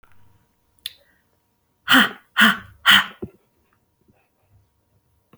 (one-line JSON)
{"exhalation_length": "5.4 s", "exhalation_amplitude": 31771, "exhalation_signal_mean_std_ratio": 0.27, "survey_phase": "beta (2021-08-13 to 2022-03-07)", "age": "18-44", "gender": "Female", "wearing_mask": "No", "symptom_runny_or_blocked_nose": true, "symptom_shortness_of_breath": true, "symptom_abdominal_pain": true, "symptom_diarrhoea": true, "symptom_fatigue": true, "symptom_headache": true, "symptom_onset": "3 days", "smoker_status": "Never smoked", "respiratory_condition_asthma": false, "respiratory_condition_other": false, "recruitment_source": "Test and Trace", "submission_delay": "1 day", "covid_test_result": "Positive", "covid_test_method": "RT-qPCR", "covid_ct_value": 33.2, "covid_ct_gene": "N gene"}